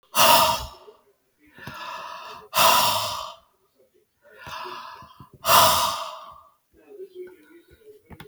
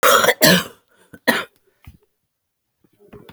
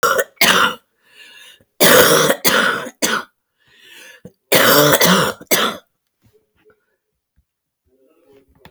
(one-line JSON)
{"exhalation_length": "8.3 s", "exhalation_amplitude": 23667, "exhalation_signal_mean_std_ratio": 0.41, "cough_length": "3.3 s", "cough_amplitude": 32768, "cough_signal_mean_std_ratio": 0.36, "three_cough_length": "8.7 s", "three_cough_amplitude": 32768, "three_cough_signal_mean_std_ratio": 0.46, "survey_phase": "beta (2021-08-13 to 2022-03-07)", "age": "45-64", "gender": "Female", "wearing_mask": "No", "symptom_cough_any": true, "symptom_runny_or_blocked_nose": true, "symptom_onset": "12 days", "smoker_status": "Current smoker (11 or more cigarettes per day)", "respiratory_condition_asthma": false, "respiratory_condition_other": false, "recruitment_source": "REACT", "submission_delay": "3 days", "covid_test_result": "Negative", "covid_test_method": "RT-qPCR"}